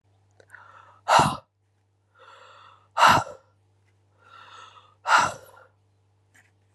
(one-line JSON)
{"exhalation_length": "6.7 s", "exhalation_amplitude": 22027, "exhalation_signal_mean_std_ratio": 0.28, "survey_phase": "beta (2021-08-13 to 2022-03-07)", "age": "18-44", "gender": "Female", "wearing_mask": "No", "symptom_cough_any": true, "symptom_new_continuous_cough": true, "symptom_runny_or_blocked_nose": true, "symptom_shortness_of_breath": true, "symptom_sore_throat": true, "symptom_fatigue": true, "symptom_fever_high_temperature": true, "symptom_headache": true, "symptom_other": true, "symptom_onset": "2 days", "smoker_status": "Never smoked", "respiratory_condition_asthma": false, "respiratory_condition_other": false, "recruitment_source": "Test and Trace", "submission_delay": "1 day", "covid_test_result": "Negative", "covid_test_method": "RT-qPCR"}